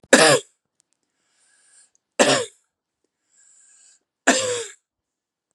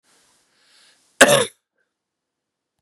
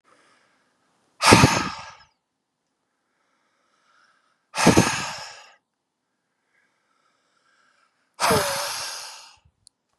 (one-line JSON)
{"three_cough_length": "5.5 s", "three_cough_amplitude": 32768, "three_cough_signal_mean_std_ratio": 0.29, "cough_length": "2.8 s", "cough_amplitude": 32768, "cough_signal_mean_std_ratio": 0.22, "exhalation_length": "10.0 s", "exhalation_amplitude": 32768, "exhalation_signal_mean_std_ratio": 0.29, "survey_phase": "beta (2021-08-13 to 2022-03-07)", "age": "18-44", "gender": "Male", "wearing_mask": "No", "symptom_cough_any": true, "symptom_runny_or_blocked_nose": true, "symptom_fatigue": true, "symptom_change_to_sense_of_smell_or_taste": true, "symptom_onset": "2 days", "smoker_status": "Never smoked", "respiratory_condition_asthma": false, "respiratory_condition_other": false, "recruitment_source": "Test and Trace", "submission_delay": "2 days", "covid_test_result": "Positive", "covid_test_method": "ePCR"}